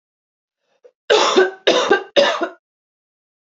three_cough_length: 3.6 s
three_cough_amplitude: 28295
three_cough_signal_mean_std_ratio: 0.43
survey_phase: beta (2021-08-13 to 2022-03-07)
age: 18-44
gender: Female
wearing_mask: 'No'
symptom_none: true
smoker_status: Never smoked
respiratory_condition_asthma: false
respiratory_condition_other: false
recruitment_source: Test and Trace
submission_delay: 77 days
covid_test_result: Negative
covid_test_method: RT-qPCR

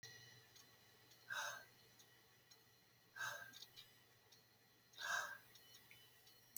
exhalation_length: 6.6 s
exhalation_amplitude: 937
exhalation_signal_mean_std_ratio: 0.48
survey_phase: beta (2021-08-13 to 2022-03-07)
age: 65+
gender: Female
wearing_mask: 'No'
symptom_shortness_of_breath: true
symptom_fatigue: true
smoker_status: Ex-smoker
respiratory_condition_asthma: true
respiratory_condition_other: false
recruitment_source: REACT
submission_delay: 2 days
covid_test_result: Negative
covid_test_method: RT-qPCR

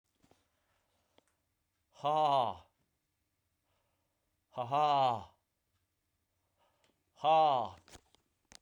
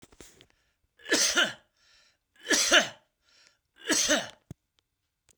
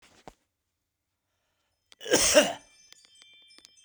exhalation_length: 8.6 s
exhalation_amplitude: 4418
exhalation_signal_mean_std_ratio: 0.34
three_cough_length: 5.4 s
three_cough_amplitude: 16246
three_cough_signal_mean_std_ratio: 0.37
cough_length: 3.8 s
cough_amplitude: 18344
cough_signal_mean_std_ratio: 0.26
survey_phase: beta (2021-08-13 to 2022-03-07)
age: 45-64
gender: Male
wearing_mask: 'No'
symptom_none: true
smoker_status: Current smoker (1 to 10 cigarettes per day)
respiratory_condition_asthma: false
respiratory_condition_other: false
recruitment_source: REACT
submission_delay: 7 days
covid_test_result: Negative
covid_test_method: RT-qPCR
influenza_a_test_result: Unknown/Void
influenza_b_test_result: Unknown/Void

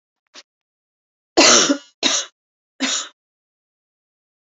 three_cough_length: 4.4 s
three_cough_amplitude: 31217
three_cough_signal_mean_std_ratio: 0.32
survey_phase: beta (2021-08-13 to 2022-03-07)
age: 45-64
gender: Female
wearing_mask: 'No'
symptom_cough_any: true
symptom_runny_or_blocked_nose: true
symptom_sore_throat: true
symptom_fatigue: true
symptom_headache: true
symptom_change_to_sense_of_smell_or_taste: true
symptom_onset: 3 days
smoker_status: Never smoked
respiratory_condition_asthma: false
respiratory_condition_other: false
recruitment_source: Test and Trace
submission_delay: 2 days
covid_test_result: Positive
covid_test_method: RT-qPCR
covid_ct_value: 20.5
covid_ct_gene: ORF1ab gene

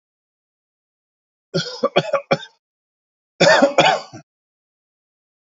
cough_length: 5.5 s
cough_amplitude: 32532
cough_signal_mean_std_ratio: 0.32
survey_phase: alpha (2021-03-01 to 2021-08-12)
age: 45-64
gender: Male
wearing_mask: 'No'
symptom_none: true
smoker_status: Ex-smoker
respiratory_condition_asthma: false
respiratory_condition_other: false
recruitment_source: REACT
submission_delay: 2 days
covid_test_result: Negative
covid_test_method: RT-qPCR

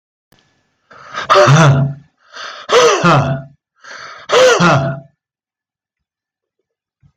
exhalation_length: 7.2 s
exhalation_amplitude: 32768
exhalation_signal_mean_std_ratio: 0.48
survey_phase: beta (2021-08-13 to 2022-03-07)
age: 65+
gender: Male
wearing_mask: 'No'
symptom_none: true
smoker_status: Ex-smoker
respiratory_condition_asthma: false
respiratory_condition_other: false
recruitment_source: REACT
submission_delay: 1 day
covid_test_result: Negative
covid_test_method: RT-qPCR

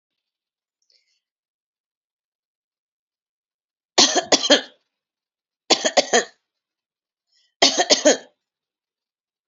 three_cough_length: 9.5 s
three_cough_amplitude: 32767
three_cough_signal_mean_std_ratio: 0.26
survey_phase: alpha (2021-03-01 to 2021-08-12)
age: 65+
gender: Female
wearing_mask: 'No'
symptom_none: true
smoker_status: Never smoked
respiratory_condition_asthma: false
respiratory_condition_other: false
recruitment_source: REACT
submission_delay: 1 day
covid_test_result: Negative
covid_test_method: RT-qPCR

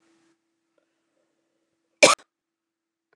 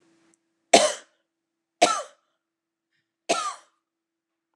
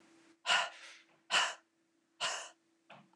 cough_length: 3.2 s
cough_amplitude: 28272
cough_signal_mean_std_ratio: 0.15
three_cough_length: 4.6 s
three_cough_amplitude: 28584
three_cough_signal_mean_std_ratio: 0.24
exhalation_length: 3.2 s
exhalation_amplitude: 4548
exhalation_signal_mean_std_ratio: 0.38
survey_phase: beta (2021-08-13 to 2022-03-07)
age: 45-64
gender: Female
wearing_mask: 'No'
symptom_none: true
smoker_status: Never smoked
respiratory_condition_asthma: false
respiratory_condition_other: false
recruitment_source: REACT
submission_delay: 2 days
covid_test_result: Negative
covid_test_method: RT-qPCR
influenza_a_test_result: Unknown/Void
influenza_b_test_result: Unknown/Void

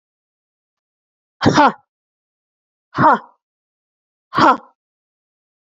exhalation_length: 5.7 s
exhalation_amplitude: 28046
exhalation_signal_mean_std_ratio: 0.28
survey_phase: beta (2021-08-13 to 2022-03-07)
age: 45-64
gender: Female
wearing_mask: 'No'
symptom_cough_any: true
smoker_status: Never smoked
respiratory_condition_asthma: false
respiratory_condition_other: false
recruitment_source: REACT
submission_delay: 1 day
covid_test_result: Negative
covid_test_method: RT-qPCR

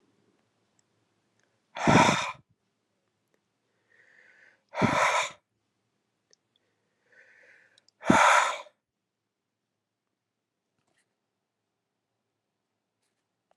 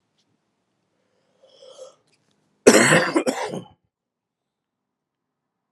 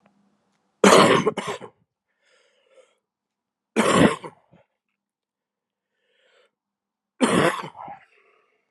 exhalation_length: 13.6 s
exhalation_amplitude: 17700
exhalation_signal_mean_std_ratio: 0.25
cough_length: 5.7 s
cough_amplitude: 32768
cough_signal_mean_std_ratio: 0.26
three_cough_length: 8.7 s
three_cough_amplitude: 30789
three_cough_signal_mean_std_ratio: 0.3
survey_phase: beta (2021-08-13 to 2022-03-07)
age: 45-64
gender: Male
wearing_mask: 'No'
symptom_cough_any: true
symptom_new_continuous_cough: true
symptom_runny_or_blocked_nose: true
symptom_sore_throat: true
symptom_fatigue: true
symptom_change_to_sense_of_smell_or_taste: true
symptom_loss_of_taste: true
symptom_onset: 4 days
smoker_status: Ex-smoker
respiratory_condition_asthma: false
respiratory_condition_other: false
recruitment_source: Test and Trace
submission_delay: 1 day
covid_test_result: Positive
covid_test_method: ePCR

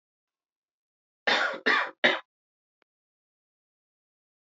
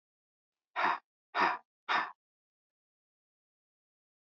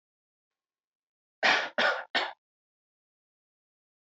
cough_length: 4.4 s
cough_amplitude: 17418
cough_signal_mean_std_ratio: 0.29
exhalation_length: 4.3 s
exhalation_amplitude: 4967
exhalation_signal_mean_std_ratio: 0.3
three_cough_length: 4.1 s
three_cough_amplitude: 11874
three_cough_signal_mean_std_ratio: 0.3
survey_phase: beta (2021-08-13 to 2022-03-07)
age: 18-44
gender: Male
wearing_mask: 'No'
symptom_runny_or_blocked_nose: true
smoker_status: Never smoked
respiratory_condition_asthma: false
respiratory_condition_other: false
recruitment_source: REACT
submission_delay: 2 days
covid_test_result: Negative
covid_test_method: RT-qPCR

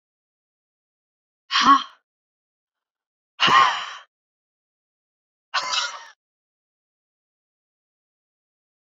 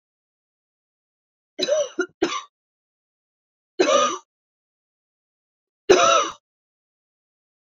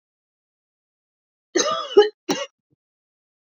exhalation_length: 8.9 s
exhalation_amplitude: 23768
exhalation_signal_mean_std_ratio: 0.26
three_cough_length: 7.8 s
three_cough_amplitude: 26131
three_cough_signal_mean_std_ratio: 0.3
cough_length: 3.6 s
cough_amplitude: 27402
cough_signal_mean_std_ratio: 0.26
survey_phase: beta (2021-08-13 to 2022-03-07)
age: 45-64
gender: Female
wearing_mask: 'No'
symptom_headache: true
symptom_onset: 5 days
smoker_status: Never smoked
respiratory_condition_asthma: false
respiratory_condition_other: false
recruitment_source: REACT
submission_delay: 2 days
covid_test_result: Positive
covid_test_method: RT-qPCR
covid_ct_value: 31.0
covid_ct_gene: N gene
influenza_a_test_result: Negative
influenza_b_test_result: Negative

